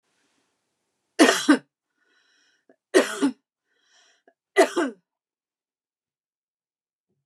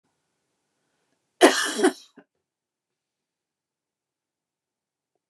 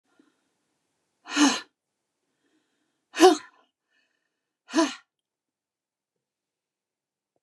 {"three_cough_length": "7.3 s", "three_cough_amplitude": 25058, "three_cough_signal_mean_std_ratio": 0.25, "cough_length": "5.3 s", "cough_amplitude": 29056, "cough_signal_mean_std_ratio": 0.19, "exhalation_length": "7.4 s", "exhalation_amplitude": 24426, "exhalation_signal_mean_std_ratio": 0.2, "survey_phase": "beta (2021-08-13 to 2022-03-07)", "age": "45-64", "gender": "Female", "wearing_mask": "No", "symptom_none": true, "smoker_status": "Never smoked", "respiratory_condition_asthma": false, "respiratory_condition_other": false, "recruitment_source": "REACT", "submission_delay": "1 day", "covid_test_result": "Negative", "covid_test_method": "RT-qPCR", "influenza_a_test_result": "Negative", "influenza_b_test_result": "Negative"}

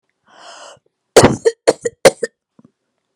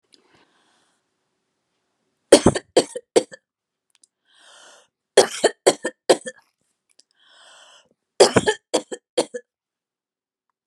{"cough_length": "3.2 s", "cough_amplitude": 32768, "cough_signal_mean_std_ratio": 0.27, "three_cough_length": "10.7 s", "three_cough_amplitude": 32768, "three_cough_signal_mean_std_ratio": 0.22, "survey_phase": "beta (2021-08-13 to 2022-03-07)", "age": "65+", "gender": "Female", "wearing_mask": "No", "symptom_none": true, "smoker_status": "Never smoked", "respiratory_condition_asthma": false, "respiratory_condition_other": false, "recruitment_source": "REACT", "submission_delay": "2 days", "covid_test_result": "Negative", "covid_test_method": "RT-qPCR"}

